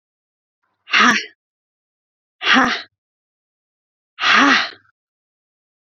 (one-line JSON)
{"exhalation_length": "5.9 s", "exhalation_amplitude": 32767, "exhalation_signal_mean_std_ratio": 0.34, "survey_phase": "beta (2021-08-13 to 2022-03-07)", "age": "18-44", "gender": "Female", "wearing_mask": "No", "symptom_cough_any": true, "symptom_new_continuous_cough": true, "symptom_runny_or_blocked_nose": true, "smoker_status": "Never smoked", "respiratory_condition_asthma": false, "respiratory_condition_other": false, "recruitment_source": "Test and Trace", "submission_delay": "2 days", "covid_test_result": "Positive", "covid_test_method": "RT-qPCR", "covid_ct_value": 23.0, "covid_ct_gene": "N gene"}